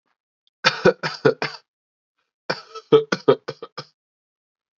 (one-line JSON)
{"cough_length": "4.8 s", "cough_amplitude": 32767, "cough_signal_mean_std_ratio": 0.28, "survey_phase": "beta (2021-08-13 to 2022-03-07)", "age": "18-44", "gender": "Male", "wearing_mask": "No", "symptom_runny_or_blocked_nose": true, "symptom_sore_throat": true, "symptom_other": true, "smoker_status": "Current smoker (1 to 10 cigarettes per day)", "respiratory_condition_asthma": false, "respiratory_condition_other": false, "recruitment_source": "Test and Trace", "submission_delay": "1 day", "covid_test_result": "Positive", "covid_test_method": "RT-qPCR", "covid_ct_value": 21.6, "covid_ct_gene": "ORF1ab gene"}